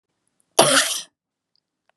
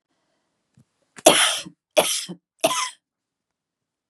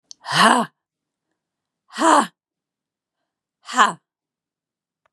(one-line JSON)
{"cough_length": "2.0 s", "cough_amplitude": 32556, "cough_signal_mean_std_ratio": 0.33, "three_cough_length": "4.1 s", "three_cough_amplitude": 32768, "three_cough_signal_mean_std_ratio": 0.31, "exhalation_length": "5.1 s", "exhalation_amplitude": 31790, "exhalation_signal_mean_std_ratio": 0.3, "survey_phase": "beta (2021-08-13 to 2022-03-07)", "age": "45-64", "gender": "Female", "wearing_mask": "No", "symptom_cough_any": true, "symptom_new_continuous_cough": true, "symptom_runny_or_blocked_nose": true, "symptom_sore_throat": true, "symptom_fatigue": true, "symptom_headache": true, "symptom_loss_of_taste": true, "symptom_onset": "2 days", "smoker_status": "Never smoked", "respiratory_condition_asthma": false, "respiratory_condition_other": false, "recruitment_source": "Test and Trace", "submission_delay": "1 day", "covid_test_result": "Negative", "covid_test_method": "LAMP"}